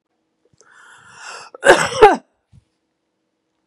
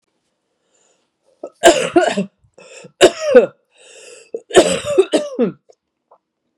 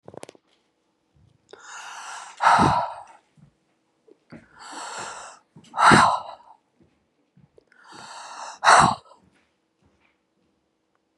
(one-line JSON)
{"cough_length": "3.7 s", "cough_amplitude": 32768, "cough_signal_mean_std_ratio": 0.26, "three_cough_length": "6.6 s", "three_cough_amplitude": 32768, "three_cough_signal_mean_std_ratio": 0.36, "exhalation_length": "11.2 s", "exhalation_amplitude": 29608, "exhalation_signal_mean_std_ratio": 0.3, "survey_phase": "beta (2021-08-13 to 2022-03-07)", "age": "65+", "gender": "Female", "wearing_mask": "No", "symptom_cough_any": true, "symptom_runny_or_blocked_nose": true, "symptom_shortness_of_breath": true, "symptom_sore_throat": true, "symptom_fatigue": true, "symptom_headache": true, "smoker_status": "Ex-smoker", "respiratory_condition_asthma": false, "respiratory_condition_other": false, "recruitment_source": "Test and Trace", "submission_delay": "1 day", "covid_test_result": "Positive", "covid_test_method": "RT-qPCR", "covid_ct_value": 17.8, "covid_ct_gene": "ORF1ab gene", "covid_ct_mean": 18.1, "covid_viral_load": "1200000 copies/ml", "covid_viral_load_category": "High viral load (>1M copies/ml)"}